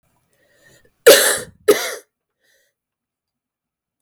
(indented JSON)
{
  "cough_length": "4.0 s",
  "cough_amplitude": 32768,
  "cough_signal_mean_std_ratio": 0.26,
  "survey_phase": "beta (2021-08-13 to 2022-03-07)",
  "age": "45-64",
  "gender": "Female",
  "wearing_mask": "No",
  "symptom_cough_any": true,
  "symptom_runny_or_blocked_nose": true,
  "symptom_shortness_of_breath": true,
  "symptom_fatigue": true,
  "symptom_onset": "11 days",
  "smoker_status": "Never smoked",
  "respiratory_condition_asthma": false,
  "respiratory_condition_other": false,
  "recruitment_source": "REACT",
  "submission_delay": "3 days",
  "covid_test_result": "Negative",
  "covid_test_method": "RT-qPCR",
  "influenza_a_test_result": "Unknown/Void",
  "influenza_b_test_result": "Unknown/Void"
}